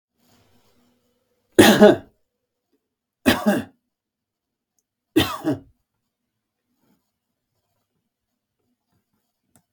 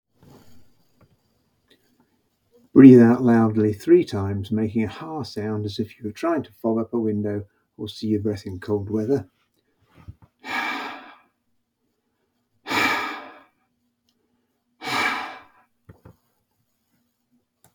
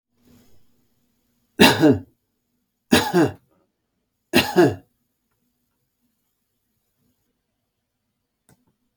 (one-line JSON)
{"cough_length": "9.7 s", "cough_amplitude": 32768, "cough_signal_mean_std_ratio": 0.22, "exhalation_length": "17.7 s", "exhalation_amplitude": 32722, "exhalation_signal_mean_std_ratio": 0.38, "three_cough_length": "9.0 s", "three_cough_amplitude": 32766, "three_cough_signal_mean_std_ratio": 0.26, "survey_phase": "beta (2021-08-13 to 2022-03-07)", "age": "65+", "gender": "Male", "wearing_mask": "No", "symptom_none": true, "smoker_status": "Ex-smoker", "respiratory_condition_asthma": false, "respiratory_condition_other": false, "recruitment_source": "REACT", "submission_delay": "1 day", "covid_test_result": "Negative", "covid_test_method": "RT-qPCR", "influenza_a_test_result": "Negative", "influenza_b_test_result": "Negative"}